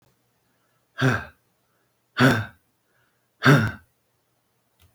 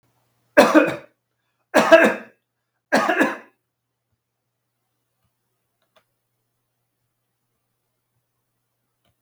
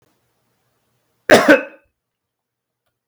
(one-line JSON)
{"exhalation_length": "4.9 s", "exhalation_amplitude": 22116, "exhalation_signal_mean_std_ratio": 0.3, "three_cough_length": "9.2 s", "three_cough_amplitude": 32768, "three_cough_signal_mean_std_ratio": 0.25, "cough_length": "3.1 s", "cough_amplitude": 32768, "cough_signal_mean_std_ratio": 0.24, "survey_phase": "beta (2021-08-13 to 2022-03-07)", "age": "45-64", "gender": "Male", "wearing_mask": "No", "symptom_none": true, "smoker_status": "Ex-smoker", "respiratory_condition_asthma": false, "respiratory_condition_other": false, "recruitment_source": "REACT", "submission_delay": "2 days", "covid_test_result": "Negative", "covid_test_method": "RT-qPCR"}